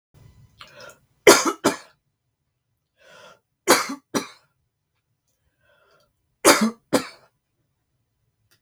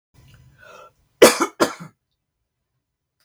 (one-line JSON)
{"three_cough_length": "8.6 s", "three_cough_amplitude": 32768, "three_cough_signal_mean_std_ratio": 0.24, "cough_length": "3.2 s", "cough_amplitude": 32768, "cough_signal_mean_std_ratio": 0.22, "survey_phase": "beta (2021-08-13 to 2022-03-07)", "age": "65+", "gender": "Female", "wearing_mask": "No", "symptom_none": true, "smoker_status": "Never smoked", "respiratory_condition_asthma": false, "respiratory_condition_other": false, "recruitment_source": "REACT", "submission_delay": "2 days", "covid_test_result": "Negative", "covid_test_method": "RT-qPCR", "influenza_a_test_result": "Negative", "influenza_b_test_result": "Negative"}